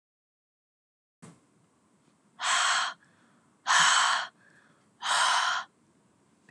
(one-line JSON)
{"exhalation_length": "6.5 s", "exhalation_amplitude": 10624, "exhalation_signal_mean_std_ratio": 0.43, "survey_phase": "beta (2021-08-13 to 2022-03-07)", "age": "18-44", "gender": "Female", "wearing_mask": "No", "symptom_cough_any": true, "symptom_sore_throat": true, "symptom_onset": "13 days", "smoker_status": "Current smoker (e-cigarettes or vapes only)", "respiratory_condition_asthma": true, "respiratory_condition_other": false, "recruitment_source": "REACT", "submission_delay": "2 days", "covid_test_result": "Negative", "covid_test_method": "RT-qPCR"}